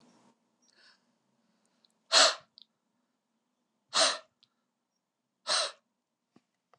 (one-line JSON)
{"exhalation_length": "6.8 s", "exhalation_amplitude": 11867, "exhalation_signal_mean_std_ratio": 0.23, "survey_phase": "beta (2021-08-13 to 2022-03-07)", "age": "65+", "gender": "Male", "wearing_mask": "No", "symptom_none": true, "smoker_status": "Ex-smoker", "respiratory_condition_asthma": false, "respiratory_condition_other": false, "recruitment_source": "REACT", "submission_delay": "3 days", "covid_test_result": "Negative", "covid_test_method": "RT-qPCR", "influenza_a_test_result": "Negative", "influenza_b_test_result": "Negative"}